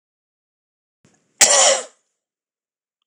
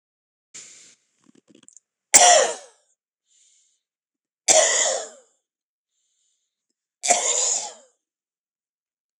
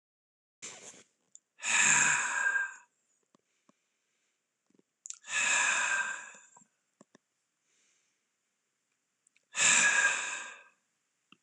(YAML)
cough_length: 3.1 s
cough_amplitude: 26028
cough_signal_mean_std_ratio: 0.28
three_cough_length: 9.2 s
three_cough_amplitude: 26028
three_cough_signal_mean_std_ratio: 0.3
exhalation_length: 11.4 s
exhalation_amplitude: 9078
exhalation_signal_mean_std_ratio: 0.41
survey_phase: beta (2021-08-13 to 2022-03-07)
age: 45-64
gender: Male
wearing_mask: 'No'
symptom_cough_any: true
smoker_status: Never smoked
respiratory_condition_asthma: true
respiratory_condition_other: false
recruitment_source: REACT
submission_delay: 17 days
covid_test_result: Negative
covid_test_method: RT-qPCR